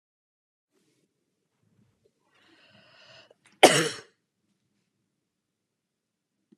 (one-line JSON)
{"cough_length": "6.6 s", "cough_amplitude": 28401, "cough_signal_mean_std_ratio": 0.14, "survey_phase": "beta (2021-08-13 to 2022-03-07)", "age": "45-64", "gender": "Female", "wearing_mask": "No", "symptom_fatigue": true, "smoker_status": "Ex-smoker", "respiratory_condition_asthma": false, "respiratory_condition_other": false, "recruitment_source": "REACT", "submission_delay": "1 day", "covid_test_result": "Negative", "covid_test_method": "RT-qPCR"}